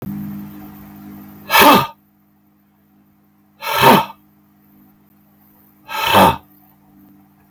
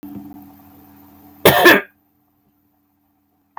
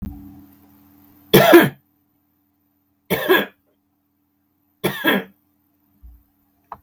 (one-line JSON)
{"exhalation_length": "7.5 s", "exhalation_amplitude": 32768, "exhalation_signal_mean_std_ratio": 0.35, "cough_length": "3.6 s", "cough_amplitude": 32768, "cough_signal_mean_std_ratio": 0.28, "three_cough_length": "6.8 s", "three_cough_amplitude": 32768, "three_cough_signal_mean_std_ratio": 0.29, "survey_phase": "beta (2021-08-13 to 2022-03-07)", "age": "65+", "gender": "Male", "wearing_mask": "No", "symptom_none": true, "smoker_status": "Never smoked", "respiratory_condition_asthma": false, "respiratory_condition_other": false, "recruitment_source": "REACT", "submission_delay": "3 days", "covid_test_result": "Negative", "covid_test_method": "RT-qPCR"}